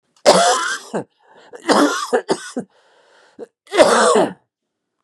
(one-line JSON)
{"cough_length": "5.0 s", "cough_amplitude": 32768, "cough_signal_mean_std_ratio": 0.48, "survey_phase": "beta (2021-08-13 to 2022-03-07)", "age": "65+", "gender": "Male", "wearing_mask": "Yes", "symptom_cough_any": true, "symptom_runny_or_blocked_nose": true, "symptom_fatigue": true, "symptom_headache": true, "symptom_onset": "3 days", "smoker_status": "Never smoked", "respiratory_condition_asthma": false, "respiratory_condition_other": false, "recruitment_source": "Test and Trace", "submission_delay": "0 days", "covid_test_result": "Positive", "covid_test_method": "RT-qPCR", "covid_ct_value": 17.8, "covid_ct_gene": "ORF1ab gene", "covid_ct_mean": 18.0, "covid_viral_load": "1200000 copies/ml", "covid_viral_load_category": "High viral load (>1M copies/ml)"}